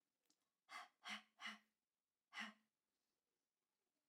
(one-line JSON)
{"exhalation_length": "4.1 s", "exhalation_amplitude": 353, "exhalation_signal_mean_std_ratio": 0.32, "survey_phase": "alpha (2021-03-01 to 2021-08-12)", "age": "18-44", "gender": "Female", "wearing_mask": "No", "symptom_none": true, "smoker_status": "Never smoked", "respiratory_condition_asthma": false, "respiratory_condition_other": false, "recruitment_source": "REACT", "submission_delay": "1 day", "covid_test_result": "Negative", "covid_test_method": "RT-qPCR"}